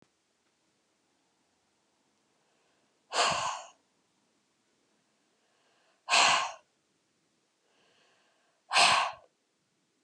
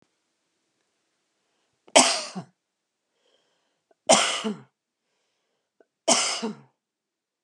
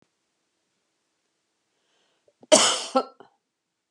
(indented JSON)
{
  "exhalation_length": "10.0 s",
  "exhalation_amplitude": 11552,
  "exhalation_signal_mean_std_ratio": 0.27,
  "three_cough_length": "7.4 s",
  "three_cough_amplitude": 28259,
  "three_cough_signal_mean_std_ratio": 0.27,
  "cough_length": "3.9 s",
  "cough_amplitude": 27830,
  "cough_signal_mean_std_ratio": 0.22,
  "survey_phase": "beta (2021-08-13 to 2022-03-07)",
  "age": "45-64",
  "gender": "Female",
  "wearing_mask": "No",
  "symptom_none": true,
  "smoker_status": "Ex-smoker",
  "respiratory_condition_asthma": false,
  "respiratory_condition_other": false,
  "recruitment_source": "REACT",
  "submission_delay": "2 days",
  "covid_test_result": "Negative",
  "covid_test_method": "RT-qPCR",
  "influenza_a_test_result": "Negative",
  "influenza_b_test_result": "Negative"
}